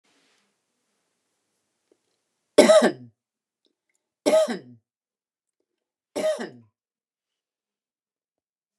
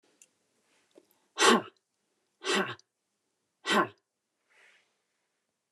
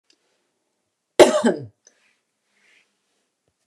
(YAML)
three_cough_length: 8.8 s
three_cough_amplitude: 29047
three_cough_signal_mean_std_ratio: 0.23
exhalation_length: 5.7 s
exhalation_amplitude: 12717
exhalation_signal_mean_std_ratio: 0.26
cough_length: 3.7 s
cough_amplitude: 29204
cough_signal_mean_std_ratio: 0.21
survey_phase: beta (2021-08-13 to 2022-03-07)
age: 45-64
gender: Female
wearing_mask: 'No'
symptom_fatigue: true
symptom_headache: true
symptom_change_to_sense_of_smell_or_taste: true
symptom_onset: 12 days
smoker_status: Never smoked
respiratory_condition_asthma: false
respiratory_condition_other: false
recruitment_source: REACT
submission_delay: 2 days
covid_test_result: Negative
covid_test_method: RT-qPCR
influenza_a_test_result: Negative
influenza_b_test_result: Negative